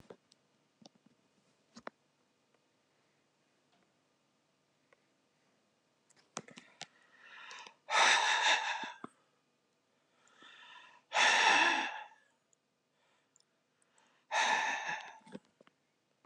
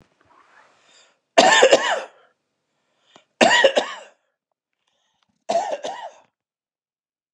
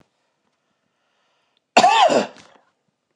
{"exhalation_length": "16.3 s", "exhalation_amplitude": 6482, "exhalation_signal_mean_std_ratio": 0.32, "three_cough_length": "7.3 s", "three_cough_amplitude": 32768, "three_cough_signal_mean_std_ratio": 0.32, "cough_length": "3.2 s", "cough_amplitude": 31420, "cough_signal_mean_std_ratio": 0.32, "survey_phase": "beta (2021-08-13 to 2022-03-07)", "age": "45-64", "gender": "Male", "wearing_mask": "No", "symptom_runny_or_blocked_nose": true, "smoker_status": "Current smoker (11 or more cigarettes per day)", "respiratory_condition_asthma": false, "respiratory_condition_other": false, "recruitment_source": "REACT", "submission_delay": "1 day", "covid_test_result": "Negative", "covid_test_method": "RT-qPCR", "influenza_a_test_result": "Negative", "influenza_b_test_result": "Negative"}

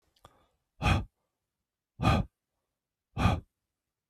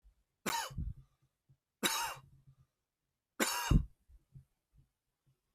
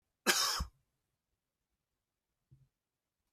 {"exhalation_length": "4.1 s", "exhalation_amplitude": 7516, "exhalation_signal_mean_std_ratio": 0.33, "three_cough_length": "5.5 s", "three_cough_amplitude": 5623, "three_cough_signal_mean_std_ratio": 0.32, "cough_length": "3.3 s", "cough_amplitude": 7235, "cough_signal_mean_std_ratio": 0.26, "survey_phase": "beta (2021-08-13 to 2022-03-07)", "age": "45-64", "gender": "Male", "wearing_mask": "No", "symptom_none": true, "smoker_status": "Never smoked", "respiratory_condition_asthma": true, "respiratory_condition_other": false, "recruitment_source": "REACT", "submission_delay": "1 day", "covid_test_result": "Negative", "covid_test_method": "RT-qPCR"}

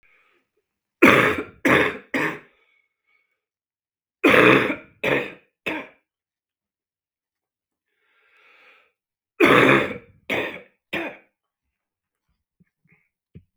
{"three_cough_length": "13.6 s", "three_cough_amplitude": 32766, "three_cough_signal_mean_std_ratio": 0.32, "survey_phase": "beta (2021-08-13 to 2022-03-07)", "age": "45-64", "gender": "Male", "wearing_mask": "No", "symptom_cough_any": true, "symptom_runny_or_blocked_nose": true, "symptom_headache": true, "symptom_change_to_sense_of_smell_or_taste": true, "symptom_onset": "3 days", "smoker_status": "Current smoker (e-cigarettes or vapes only)", "respiratory_condition_asthma": false, "respiratory_condition_other": false, "recruitment_source": "Test and Trace", "submission_delay": "1 day", "covid_test_result": "Positive", "covid_test_method": "RT-qPCR", "covid_ct_value": 18.0, "covid_ct_gene": "N gene", "covid_ct_mean": 18.1, "covid_viral_load": "1200000 copies/ml", "covid_viral_load_category": "High viral load (>1M copies/ml)"}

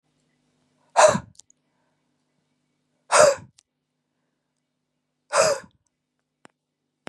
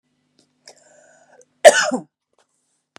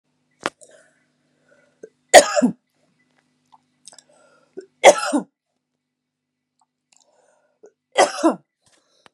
{"exhalation_length": "7.1 s", "exhalation_amplitude": 27286, "exhalation_signal_mean_std_ratio": 0.24, "cough_length": "3.0 s", "cough_amplitude": 32768, "cough_signal_mean_std_ratio": 0.2, "three_cough_length": "9.1 s", "three_cough_amplitude": 32768, "three_cough_signal_mean_std_ratio": 0.21, "survey_phase": "beta (2021-08-13 to 2022-03-07)", "age": "18-44", "gender": "Female", "wearing_mask": "No", "symptom_none": true, "symptom_onset": "11 days", "smoker_status": "Never smoked", "respiratory_condition_asthma": true, "respiratory_condition_other": false, "recruitment_source": "REACT", "submission_delay": "2 days", "covid_test_result": "Negative", "covid_test_method": "RT-qPCR", "influenza_a_test_result": "Negative", "influenza_b_test_result": "Negative"}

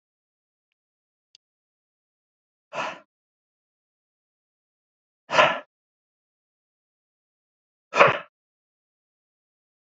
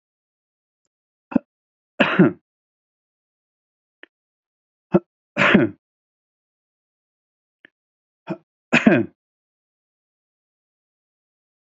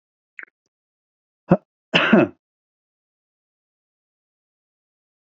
{"exhalation_length": "10.0 s", "exhalation_amplitude": 27566, "exhalation_signal_mean_std_ratio": 0.17, "three_cough_length": "11.7 s", "three_cough_amplitude": 27750, "three_cough_signal_mean_std_ratio": 0.22, "cough_length": "5.3 s", "cough_amplitude": 31196, "cough_signal_mean_std_ratio": 0.2, "survey_phase": "beta (2021-08-13 to 2022-03-07)", "age": "65+", "gender": "Male", "wearing_mask": "No", "symptom_none": true, "smoker_status": "Never smoked", "respiratory_condition_asthma": false, "respiratory_condition_other": false, "recruitment_source": "Test and Trace", "submission_delay": "1 day", "covid_test_result": "Positive", "covid_test_method": "RT-qPCR", "covid_ct_value": 26.3, "covid_ct_gene": "N gene"}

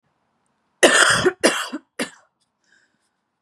{"cough_length": "3.4 s", "cough_amplitude": 32641, "cough_signal_mean_std_ratio": 0.36, "survey_phase": "beta (2021-08-13 to 2022-03-07)", "age": "18-44", "gender": "Female", "wearing_mask": "No", "symptom_fatigue": true, "symptom_headache": true, "symptom_onset": "4 days", "smoker_status": "Never smoked", "respiratory_condition_asthma": false, "respiratory_condition_other": false, "recruitment_source": "Test and Trace", "submission_delay": "2 days", "covid_test_result": "Positive", "covid_test_method": "RT-qPCR", "covid_ct_value": 18.1, "covid_ct_gene": "ORF1ab gene", "covid_ct_mean": 18.5, "covid_viral_load": "830000 copies/ml", "covid_viral_load_category": "Low viral load (10K-1M copies/ml)"}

